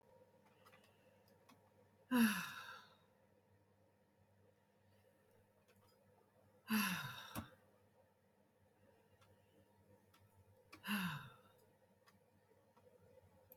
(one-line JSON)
{"exhalation_length": "13.6 s", "exhalation_amplitude": 2228, "exhalation_signal_mean_std_ratio": 0.29, "survey_phase": "alpha (2021-03-01 to 2021-08-12)", "age": "65+", "gender": "Female", "wearing_mask": "No", "symptom_none": true, "symptom_onset": "6 days", "smoker_status": "Never smoked", "respiratory_condition_asthma": false, "respiratory_condition_other": false, "recruitment_source": "REACT", "submission_delay": "1 day", "covid_test_result": "Negative", "covid_test_method": "RT-qPCR"}